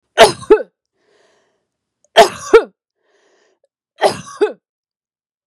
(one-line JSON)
{"three_cough_length": "5.5 s", "three_cough_amplitude": 32768, "three_cough_signal_mean_std_ratio": 0.27, "survey_phase": "beta (2021-08-13 to 2022-03-07)", "age": "45-64", "gender": "Female", "wearing_mask": "No", "symptom_none": true, "smoker_status": "Ex-smoker", "respiratory_condition_asthma": false, "respiratory_condition_other": false, "recruitment_source": "REACT", "submission_delay": "1 day", "covid_test_result": "Negative", "covid_test_method": "RT-qPCR"}